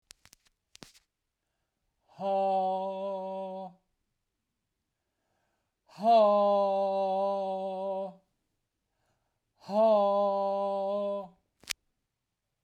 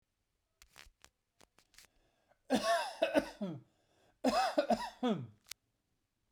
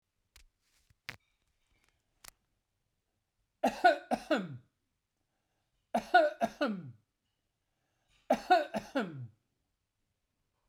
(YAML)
exhalation_length: 12.6 s
exhalation_amplitude: 13968
exhalation_signal_mean_std_ratio: 0.54
cough_length: 6.3 s
cough_amplitude: 5198
cough_signal_mean_std_ratio: 0.4
three_cough_length: 10.7 s
three_cough_amplitude: 8851
three_cough_signal_mean_std_ratio: 0.28
survey_phase: beta (2021-08-13 to 2022-03-07)
age: 45-64
gender: Male
wearing_mask: 'No'
symptom_none: true
smoker_status: Never smoked
respiratory_condition_asthma: false
respiratory_condition_other: false
recruitment_source: REACT
submission_delay: 1 day
covid_test_result: Negative
covid_test_method: RT-qPCR